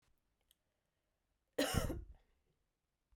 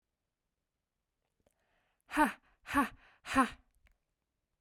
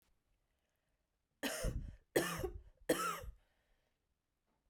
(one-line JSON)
{"cough_length": "3.2 s", "cough_amplitude": 2885, "cough_signal_mean_std_ratio": 0.29, "exhalation_length": "4.6 s", "exhalation_amplitude": 5448, "exhalation_signal_mean_std_ratio": 0.26, "three_cough_length": "4.7 s", "three_cough_amplitude": 3434, "three_cough_signal_mean_std_ratio": 0.39, "survey_phase": "beta (2021-08-13 to 2022-03-07)", "age": "18-44", "gender": "Female", "wearing_mask": "No", "symptom_cough_any": true, "symptom_sore_throat": true, "symptom_fatigue": true, "symptom_headache": true, "smoker_status": "Never smoked", "respiratory_condition_asthma": false, "respiratory_condition_other": false, "recruitment_source": "Test and Trace", "submission_delay": "2 days", "covid_test_result": "Positive", "covid_test_method": "RT-qPCR", "covid_ct_value": 35.1, "covid_ct_gene": "N gene"}